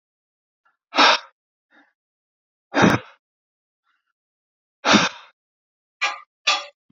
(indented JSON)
{
  "exhalation_length": "6.9 s",
  "exhalation_amplitude": 27781,
  "exhalation_signal_mean_std_ratio": 0.29,
  "survey_phase": "alpha (2021-03-01 to 2021-08-12)",
  "age": "45-64",
  "gender": "Male",
  "wearing_mask": "No",
  "symptom_none": true,
  "smoker_status": "Ex-smoker",
  "respiratory_condition_asthma": false,
  "respiratory_condition_other": false,
  "recruitment_source": "REACT",
  "submission_delay": "1 day",
  "covid_test_result": "Negative",
  "covid_test_method": "RT-qPCR"
}